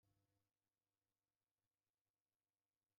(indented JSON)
{
  "exhalation_length": "3.0 s",
  "exhalation_amplitude": 7,
  "exhalation_signal_mean_std_ratio": 0.39,
  "survey_phase": "alpha (2021-03-01 to 2021-08-12)",
  "age": "65+",
  "gender": "Male",
  "wearing_mask": "No",
  "symptom_none": true,
  "smoker_status": "Ex-smoker",
  "respiratory_condition_asthma": false,
  "respiratory_condition_other": false,
  "recruitment_source": "REACT",
  "submission_delay": "1 day",
  "covid_test_result": "Negative",
  "covid_test_method": "RT-qPCR"
}